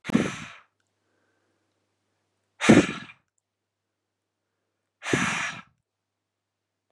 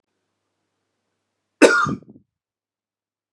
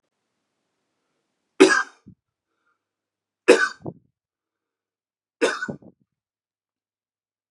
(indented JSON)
{
  "exhalation_length": "6.9 s",
  "exhalation_amplitude": 23388,
  "exhalation_signal_mean_std_ratio": 0.25,
  "cough_length": "3.3 s",
  "cough_amplitude": 32767,
  "cough_signal_mean_std_ratio": 0.22,
  "three_cough_length": "7.5 s",
  "three_cough_amplitude": 32447,
  "three_cough_signal_mean_std_ratio": 0.2,
  "survey_phase": "beta (2021-08-13 to 2022-03-07)",
  "age": "18-44",
  "gender": "Male",
  "wearing_mask": "No",
  "symptom_none": true,
  "smoker_status": "Never smoked",
  "respiratory_condition_asthma": false,
  "respiratory_condition_other": false,
  "recruitment_source": "REACT",
  "submission_delay": "2 days",
  "covid_test_result": "Negative",
  "covid_test_method": "RT-qPCR",
  "influenza_a_test_result": "Negative",
  "influenza_b_test_result": "Negative"
}